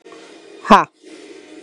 {"exhalation_length": "1.6 s", "exhalation_amplitude": 32768, "exhalation_signal_mean_std_ratio": 0.28, "survey_phase": "beta (2021-08-13 to 2022-03-07)", "age": "45-64", "gender": "Female", "wearing_mask": "Yes", "symptom_cough_any": true, "smoker_status": "Prefer not to say", "respiratory_condition_asthma": false, "respiratory_condition_other": false, "recruitment_source": "REACT", "submission_delay": "2 days", "covid_test_result": "Negative", "covid_test_method": "RT-qPCR", "influenza_a_test_result": "Negative", "influenza_b_test_result": "Negative"}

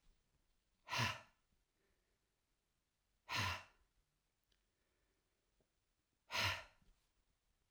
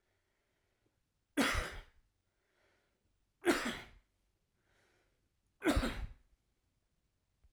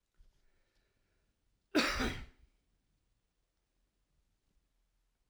{"exhalation_length": "7.7 s", "exhalation_amplitude": 1563, "exhalation_signal_mean_std_ratio": 0.28, "three_cough_length": "7.5 s", "three_cough_amplitude": 4149, "three_cough_signal_mean_std_ratio": 0.3, "cough_length": "5.3 s", "cough_amplitude": 4374, "cough_signal_mean_std_ratio": 0.24, "survey_phase": "alpha (2021-03-01 to 2021-08-12)", "age": "45-64", "gender": "Male", "wearing_mask": "No", "symptom_none": true, "smoker_status": "Never smoked", "respiratory_condition_asthma": false, "respiratory_condition_other": false, "recruitment_source": "REACT", "submission_delay": "1 day", "covid_test_result": "Negative", "covid_test_method": "RT-qPCR"}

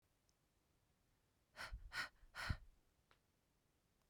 {"exhalation_length": "4.1 s", "exhalation_amplitude": 1189, "exhalation_signal_mean_std_ratio": 0.33, "survey_phase": "beta (2021-08-13 to 2022-03-07)", "age": "18-44", "gender": "Female", "wearing_mask": "No", "symptom_runny_or_blocked_nose": true, "smoker_status": "Ex-smoker", "respiratory_condition_asthma": false, "respiratory_condition_other": false, "recruitment_source": "REACT", "submission_delay": "1 day", "covid_test_result": "Negative", "covid_test_method": "RT-qPCR", "influenza_a_test_result": "Negative", "influenza_b_test_result": "Negative"}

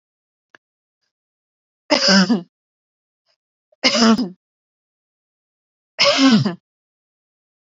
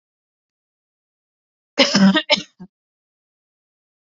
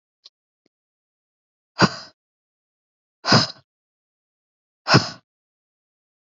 {"three_cough_length": "7.7 s", "three_cough_amplitude": 30673, "three_cough_signal_mean_std_ratio": 0.35, "cough_length": "4.2 s", "cough_amplitude": 28359, "cough_signal_mean_std_ratio": 0.27, "exhalation_length": "6.3 s", "exhalation_amplitude": 29032, "exhalation_signal_mean_std_ratio": 0.21, "survey_phase": "beta (2021-08-13 to 2022-03-07)", "age": "18-44", "gender": "Female", "wearing_mask": "No", "symptom_none": true, "smoker_status": "Never smoked", "respiratory_condition_asthma": false, "respiratory_condition_other": false, "recruitment_source": "REACT", "submission_delay": "1 day", "covid_test_result": "Negative", "covid_test_method": "RT-qPCR", "influenza_a_test_result": "Negative", "influenza_b_test_result": "Negative"}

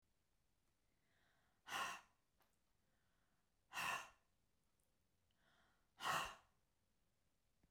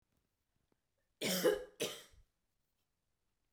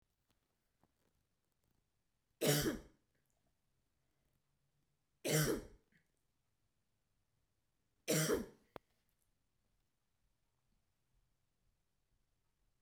{"exhalation_length": "7.7 s", "exhalation_amplitude": 1017, "exhalation_signal_mean_std_ratio": 0.3, "cough_length": "3.5 s", "cough_amplitude": 2962, "cough_signal_mean_std_ratio": 0.3, "three_cough_length": "12.8 s", "three_cough_amplitude": 2940, "three_cough_signal_mean_std_ratio": 0.24, "survey_phase": "beta (2021-08-13 to 2022-03-07)", "age": "45-64", "gender": "Female", "wearing_mask": "No", "symptom_cough_any": true, "smoker_status": "Ex-smoker", "respiratory_condition_asthma": false, "respiratory_condition_other": false, "recruitment_source": "REACT", "submission_delay": "2 days", "covid_test_result": "Negative", "covid_test_method": "RT-qPCR"}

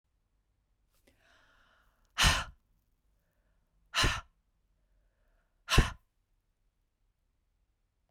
{"exhalation_length": "8.1 s", "exhalation_amplitude": 11520, "exhalation_signal_mean_std_ratio": 0.22, "survey_phase": "beta (2021-08-13 to 2022-03-07)", "age": "45-64", "gender": "Female", "wearing_mask": "No", "symptom_cough_any": true, "symptom_runny_or_blocked_nose": true, "symptom_fatigue": true, "symptom_change_to_sense_of_smell_or_taste": true, "symptom_other": true, "symptom_onset": "2 days", "smoker_status": "Never smoked", "respiratory_condition_asthma": false, "respiratory_condition_other": false, "recruitment_source": "Test and Trace", "submission_delay": "1 day", "covid_test_result": "Positive", "covid_test_method": "RT-qPCR", "covid_ct_value": 30.7, "covid_ct_gene": "N gene"}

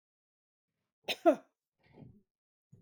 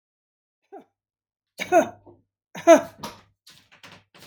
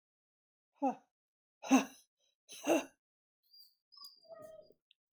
{"cough_length": "2.8 s", "cough_amplitude": 7376, "cough_signal_mean_std_ratio": 0.18, "three_cough_length": "4.3 s", "three_cough_amplitude": 27766, "three_cough_signal_mean_std_ratio": 0.22, "exhalation_length": "5.1 s", "exhalation_amplitude": 5838, "exhalation_signal_mean_std_ratio": 0.25, "survey_phase": "beta (2021-08-13 to 2022-03-07)", "age": "65+", "gender": "Female", "wearing_mask": "No", "symptom_none": true, "smoker_status": "Never smoked", "respiratory_condition_asthma": true, "respiratory_condition_other": false, "recruitment_source": "REACT", "submission_delay": "4 days", "covid_test_result": "Negative", "covid_test_method": "RT-qPCR", "influenza_a_test_result": "Negative", "influenza_b_test_result": "Negative"}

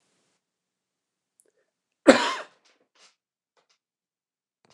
{"cough_length": "4.7 s", "cough_amplitude": 29204, "cough_signal_mean_std_ratio": 0.15, "survey_phase": "beta (2021-08-13 to 2022-03-07)", "age": "45-64", "gender": "Male", "wearing_mask": "No", "symptom_sore_throat": true, "symptom_fatigue": true, "symptom_onset": "3 days", "smoker_status": "Ex-smoker", "respiratory_condition_asthma": false, "respiratory_condition_other": false, "recruitment_source": "Test and Trace", "submission_delay": "2 days", "covid_test_result": "Positive", "covid_test_method": "RT-qPCR"}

